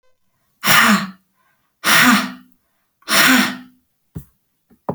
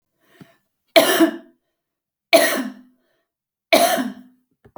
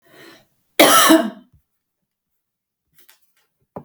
{"exhalation_length": "4.9 s", "exhalation_amplitude": 32768, "exhalation_signal_mean_std_ratio": 0.44, "three_cough_length": "4.8 s", "three_cough_amplitude": 32768, "three_cough_signal_mean_std_ratio": 0.36, "cough_length": "3.8 s", "cough_amplitude": 32768, "cough_signal_mean_std_ratio": 0.29, "survey_phase": "beta (2021-08-13 to 2022-03-07)", "age": "45-64", "gender": "Female", "wearing_mask": "No", "symptom_fatigue": true, "symptom_change_to_sense_of_smell_or_taste": true, "smoker_status": "Current smoker (e-cigarettes or vapes only)", "respiratory_condition_asthma": false, "respiratory_condition_other": false, "recruitment_source": "REACT", "submission_delay": "15 days", "covid_test_result": "Negative", "covid_test_method": "RT-qPCR"}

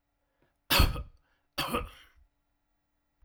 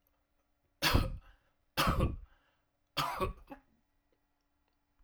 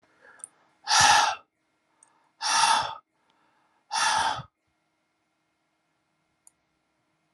{"cough_length": "3.2 s", "cough_amplitude": 11304, "cough_signal_mean_std_ratio": 0.3, "three_cough_length": "5.0 s", "three_cough_amplitude": 7545, "three_cough_signal_mean_std_ratio": 0.37, "exhalation_length": "7.3 s", "exhalation_amplitude": 17403, "exhalation_signal_mean_std_ratio": 0.35, "survey_phase": "alpha (2021-03-01 to 2021-08-12)", "age": "65+", "gender": "Male", "wearing_mask": "No", "symptom_none": true, "symptom_onset": "6 days", "smoker_status": "Never smoked", "respiratory_condition_asthma": false, "respiratory_condition_other": false, "recruitment_source": "REACT", "submission_delay": "5 days", "covid_test_result": "Negative", "covid_test_method": "RT-qPCR"}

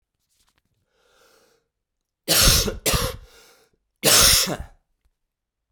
{"three_cough_length": "5.7 s", "three_cough_amplitude": 27685, "three_cough_signal_mean_std_ratio": 0.37, "survey_phase": "beta (2021-08-13 to 2022-03-07)", "age": "18-44", "gender": "Male", "wearing_mask": "No", "symptom_cough_any": true, "symptom_new_continuous_cough": true, "symptom_runny_or_blocked_nose": true, "symptom_fatigue": true, "symptom_headache": true, "symptom_change_to_sense_of_smell_or_taste": true, "symptom_loss_of_taste": true, "symptom_onset": "4 days", "smoker_status": "Never smoked", "respiratory_condition_asthma": false, "respiratory_condition_other": false, "recruitment_source": "Test and Trace", "submission_delay": "1 day", "covid_test_result": "Positive", "covid_test_method": "RT-qPCR", "covid_ct_value": 16.7, "covid_ct_gene": "ORF1ab gene", "covid_ct_mean": 17.4, "covid_viral_load": "2000000 copies/ml", "covid_viral_load_category": "High viral load (>1M copies/ml)"}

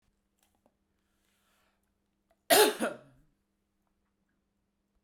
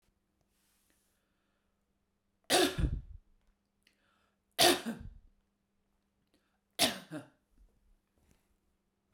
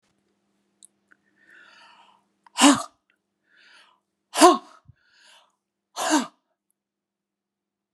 {"cough_length": "5.0 s", "cough_amplitude": 12128, "cough_signal_mean_std_ratio": 0.2, "three_cough_length": "9.1 s", "three_cough_amplitude": 9164, "three_cough_signal_mean_std_ratio": 0.25, "exhalation_length": "7.9 s", "exhalation_amplitude": 32706, "exhalation_signal_mean_std_ratio": 0.21, "survey_phase": "beta (2021-08-13 to 2022-03-07)", "age": "45-64", "gender": "Female", "wearing_mask": "No", "symptom_none": true, "smoker_status": "Ex-smoker", "respiratory_condition_asthma": false, "respiratory_condition_other": false, "recruitment_source": "REACT", "submission_delay": "2 days", "covid_test_result": "Negative", "covid_test_method": "RT-qPCR"}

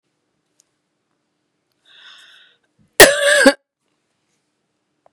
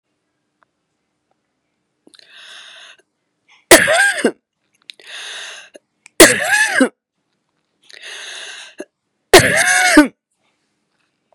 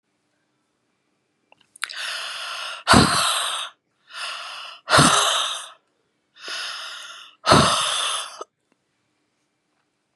{"cough_length": "5.1 s", "cough_amplitude": 32768, "cough_signal_mean_std_ratio": 0.23, "three_cough_length": "11.3 s", "three_cough_amplitude": 32768, "three_cough_signal_mean_std_ratio": 0.32, "exhalation_length": "10.2 s", "exhalation_amplitude": 31810, "exhalation_signal_mean_std_ratio": 0.42, "survey_phase": "beta (2021-08-13 to 2022-03-07)", "age": "45-64", "gender": "Female", "wearing_mask": "No", "symptom_cough_any": true, "symptom_runny_or_blocked_nose": true, "symptom_sore_throat": true, "symptom_fatigue": true, "symptom_headache": true, "smoker_status": "Never smoked", "respiratory_condition_asthma": false, "respiratory_condition_other": false, "recruitment_source": "Test and Trace", "submission_delay": "2 days", "covid_test_result": "Positive", "covid_test_method": "LFT"}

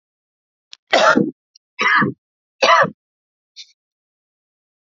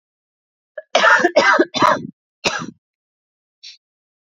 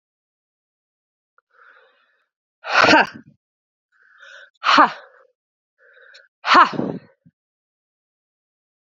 {"three_cough_length": "4.9 s", "three_cough_amplitude": 31528, "three_cough_signal_mean_std_ratio": 0.35, "cough_length": "4.4 s", "cough_amplitude": 29109, "cough_signal_mean_std_ratio": 0.39, "exhalation_length": "8.9 s", "exhalation_amplitude": 28477, "exhalation_signal_mean_std_ratio": 0.26, "survey_phase": "beta (2021-08-13 to 2022-03-07)", "age": "18-44", "gender": "Female", "wearing_mask": "No", "symptom_sore_throat": true, "symptom_fatigue": true, "symptom_change_to_sense_of_smell_or_taste": true, "symptom_loss_of_taste": true, "symptom_onset": "3 days", "smoker_status": "Current smoker (1 to 10 cigarettes per day)", "respiratory_condition_asthma": false, "respiratory_condition_other": false, "recruitment_source": "Test and Trace", "submission_delay": "2 days", "covid_test_result": "Positive", "covid_test_method": "ePCR"}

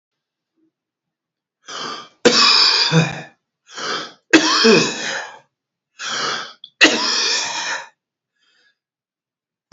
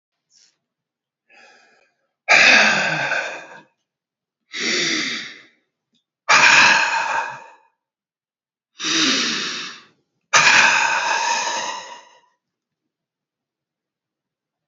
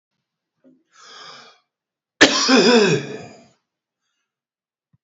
{"three_cough_length": "9.7 s", "three_cough_amplitude": 32768, "three_cough_signal_mean_std_ratio": 0.45, "exhalation_length": "14.7 s", "exhalation_amplitude": 30505, "exhalation_signal_mean_std_ratio": 0.45, "cough_length": "5.0 s", "cough_amplitude": 30404, "cough_signal_mean_std_ratio": 0.33, "survey_phase": "beta (2021-08-13 to 2022-03-07)", "age": "65+", "gender": "Male", "wearing_mask": "No", "symptom_none": true, "smoker_status": "Never smoked", "respiratory_condition_asthma": false, "respiratory_condition_other": false, "recruitment_source": "REACT", "submission_delay": "2 days", "covid_test_result": "Negative", "covid_test_method": "RT-qPCR", "influenza_a_test_result": "Negative", "influenza_b_test_result": "Negative"}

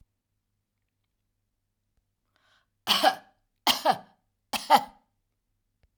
{"cough_length": "6.0 s", "cough_amplitude": 16435, "cough_signal_mean_std_ratio": 0.25, "survey_phase": "alpha (2021-03-01 to 2021-08-12)", "age": "65+", "gender": "Female", "wearing_mask": "No", "symptom_none": true, "smoker_status": "Never smoked", "respiratory_condition_asthma": false, "respiratory_condition_other": false, "recruitment_source": "REACT", "submission_delay": "2 days", "covid_test_result": "Negative", "covid_test_method": "RT-qPCR"}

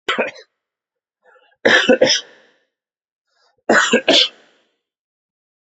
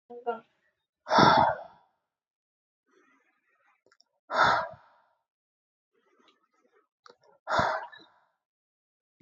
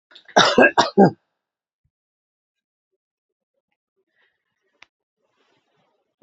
{"three_cough_length": "5.7 s", "three_cough_amplitude": 31692, "three_cough_signal_mean_std_ratio": 0.36, "exhalation_length": "9.2 s", "exhalation_amplitude": 15576, "exhalation_signal_mean_std_ratio": 0.28, "cough_length": "6.2 s", "cough_amplitude": 29673, "cough_signal_mean_std_ratio": 0.22, "survey_phase": "beta (2021-08-13 to 2022-03-07)", "age": "45-64", "gender": "Male", "wearing_mask": "No", "symptom_cough_any": true, "symptom_sore_throat": true, "symptom_fever_high_temperature": true, "symptom_headache": true, "symptom_onset": "3 days", "smoker_status": "Never smoked", "respiratory_condition_asthma": true, "respiratory_condition_other": false, "recruitment_source": "Test and Trace", "submission_delay": "0 days", "covid_test_result": "Positive", "covid_test_method": "RT-qPCR", "covid_ct_value": 24.1, "covid_ct_gene": "N gene"}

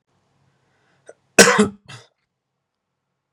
{"cough_length": "3.3 s", "cough_amplitude": 32768, "cough_signal_mean_std_ratio": 0.22, "survey_phase": "beta (2021-08-13 to 2022-03-07)", "age": "18-44", "gender": "Male", "wearing_mask": "No", "symptom_headache": true, "smoker_status": "Never smoked", "respiratory_condition_asthma": false, "respiratory_condition_other": false, "recruitment_source": "REACT", "submission_delay": "1 day", "covid_test_result": "Negative", "covid_test_method": "RT-qPCR", "influenza_a_test_result": "Negative", "influenza_b_test_result": "Negative"}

